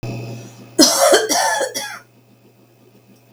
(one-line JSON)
{"cough_length": "3.3 s", "cough_amplitude": 32768, "cough_signal_mean_std_ratio": 0.49, "survey_phase": "beta (2021-08-13 to 2022-03-07)", "age": "45-64", "gender": "Female", "wearing_mask": "No", "symptom_none": true, "smoker_status": "Never smoked", "respiratory_condition_asthma": false, "respiratory_condition_other": false, "recruitment_source": "REACT", "submission_delay": "2 days", "covid_test_result": "Negative", "covid_test_method": "RT-qPCR", "influenza_a_test_result": "Negative", "influenza_b_test_result": "Negative"}